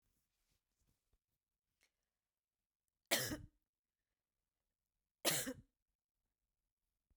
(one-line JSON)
{"cough_length": "7.2 s", "cough_amplitude": 3178, "cough_signal_mean_std_ratio": 0.21, "survey_phase": "beta (2021-08-13 to 2022-03-07)", "age": "65+", "gender": "Female", "wearing_mask": "No", "symptom_diarrhoea": true, "symptom_onset": "12 days", "smoker_status": "Never smoked", "respiratory_condition_asthma": false, "respiratory_condition_other": false, "recruitment_source": "REACT", "submission_delay": "3 days", "covid_test_result": "Negative", "covid_test_method": "RT-qPCR"}